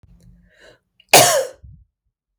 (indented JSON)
{
  "cough_length": "2.4 s",
  "cough_amplitude": 32768,
  "cough_signal_mean_std_ratio": 0.3,
  "survey_phase": "beta (2021-08-13 to 2022-03-07)",
  "age": "18-44",
  "gender": "Female",
  "wearing_mask": "No",
  "symptom_cough_any": true,
  "symptom_fatigue": true,
  "symptom_other": true,
  "smoker_status": "Ex-smoker",
  "respiratory_condition_asthma": false,
  "respiratory_condition_other": false,
  "recruitment_source": "REACT",
  "submission_delay": "1 day",
  "covid_test_result": "Negative",
  "covid_test_method": "RT-qPCR"
}